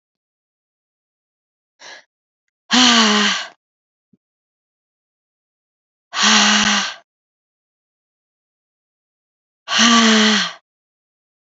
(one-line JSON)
{"exhalation_length": "11.4 s", "exhalation_amplitude": 31407, "exhalation_signal_mean_std_ratio": 0.37, "survey_phase": "beta (2021-08-13 to 2022-03-07)", "age": "18-44", "gender": "Female", "wearing_mask": "No", "symptom_cough_any": true, "symptom_new_continuous_cough": true, "symptom_runny_or_blocked_nose": true, "symptom_fatigue": true, "symptom_fever_high_temperature": true, "symptom_headache": true, "smoker_status": "Never smoked", "respiratory_condition_asthma": true, "respiratory_condition_other": false, "recruitment_source": "Test and Trace", "submission_delay": "2 days", "covid_test_result": "Positive", "covid_test_method": "ePCR"}